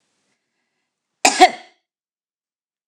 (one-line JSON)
{"cough_length": "2.9 s", "cough_amplitude": 29204, "cough_signal_mean_std_ratio": 0.2, "survey_phase": "beta (2021-08-13 to 2022-03-07)", "age": "65+", "gender": "Female", "wearing_mask": "No", "symptom_runny_or_blocked_nose": true, "symptom_sore_throat": true, "symptom_abdominal_pain": true, "symptom_fatigue": true, "smoker_status": "Current smoker (e-cigarettes or vapes only)", "respiratory_condition_asthma": false, "respiratory_condition_other": false, "recruitment_source": "REACT", "submission_delay": "1 day", "covid_test_result": "Negative", "covid_test_method": "RT-qPCR", "influenza_a_test_result": "Negative", "influenza_b_test_result": "Negative"}